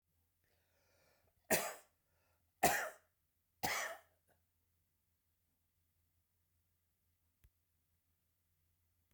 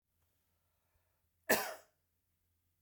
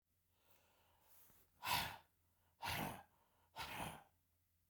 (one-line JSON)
{"three_cough_length": "9.1 s", "three_cough_amplitude": 4062, "three_cough_signal_mean_std_ratio": 0.22, "cough_length": "2.8 s", "cough_amplitude": 5218, "cough_signal_mean_std_ratio": 0.2, "exhalation_length": "4.7 s", "exhalation_amplitude": 1556, "exhalation_signal_mean_std_ratio": 0.4, "survey_phase": "beta (2021-08-13 to 2022-03-07)", "age": "65+", "gender": "Male", "wearing_mask": "No", "symptom_none": true, "smoker_status": "Ex-smoker", "respiratory_condition_asthma": false, "respiratory_condition_other": false, "recruitment_source": "REACT", "submission_delay": "1 day", "covid_test_result": "Negative", "covid_test_method": "RT-qPCR"}